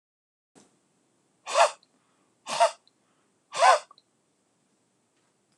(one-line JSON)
{"exhalation_length": "5.6 s", "exhalation_amplitude": 16403, "exhalation_signal_mean_std_ratio": 0.25, "survey_phase": "alpha (2021-03-01 to 2021-08-12)", "age": "65+", "gender": "Male", "wearing_mask": "No", "symptom_none": true, "smoker_status": "Never smoked", "respiratory_condition_asthma": true, "respiratory_condition_other": false, "recruitment_source": "REACT", "submission_delay": "1 day", "covid_test_result": "Negative", "covid_test_method": "RT-qPCR"}